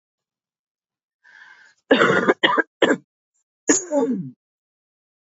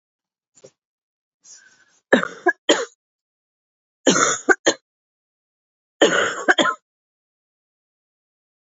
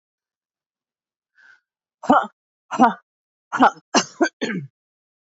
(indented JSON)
{
  "cough_length": "5.2 s",
  "cough_amplitude": 27311,
  "cough_signal_mean_std_ratio": 0.38,
  "three_cough_length": "8.6 s",
  "three_cough_amplitude": 28255,
  "three_cough_signal_mean_std_ratio": 0.29,
  "exhalation_length": "5.3 s",
  "exhalation_amplitude": 28012,
  "exhalation_signal_mean_std_ratio": 0.29,
  "survey_phase": "beta (2021-08-13 to 2022-03-07)",
  "age": "18-44",
  "gender": "Female",
  "wearing_mask": "No",
  "symptom_cough_any": true,
  "symptom_runny_or_blocked_nose": true,
  "symptom_sore_throat": true,
  "symptom_fatigue": true,
  "symptom_fever_high_temperature": true,
  "symptom_headache": true,
  "symptom_onset": "2 days",
  "smoker_status": "Ex-smoker",
  "respiratory_condition_asthma": false,
  "respiratory_condition_other": false,
  "recruitment_source": "Test and Trace",
  "submission_delay": "0 days",
  "covid_test_result": "Positive",
  "covid_test_method": "RT-qPCR",
  "covid_ct_value": 18.2,
  "covid_ct_gene": "ORF1ab gene",
  "covid_ct_mean": 18.4,
  "covid_viral_load": "940000 copies/ml",
  "covid_viral_load_category": "Low viral load (10K-1M copies/ml)"
}